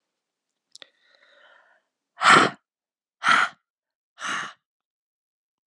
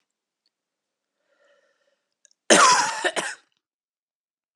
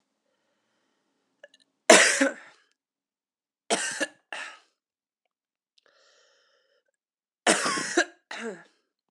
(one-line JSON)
{"exhalation_length": "5.7 s", "exhalation_amplitude": 26925, "exhalation_signal_mean_std_ratio": 0.26, "cough_length": "4.6 s", "cough_amplitude": 31958, "cough_signal_mean_std_ratio": 0.28, "three_cough_length": "9.1 s", "three_cough_amplitude": 32148, "three_cough_signal_mean_std_ratio": 0.26, "survey_phase": "alpha (2021-03-01 to 2021-08-12)", "age": "18-44", "gender": "Female", "wearing_mask": "No", "symptom_cough_any": true, "symptom_fatigue": true, "symptom_headache": true, "symptom_change_to_sense_of_smell_or_taste": true, "symptom_loss_of_taste": true, "symptom_onset": "6 days", "smoker_status": "Never smoked", "respiratory_condition_asthma": false, "respiratory_condition_other": false, "recruitment_source": "Test and Trace", "submission_delay": "3 days", "covid_test_result": "Positive", "covid_test_method": "RT-qPCR", "covid_ct_value": 20.0, "covid_ct_gene": "ORF1ab gene"}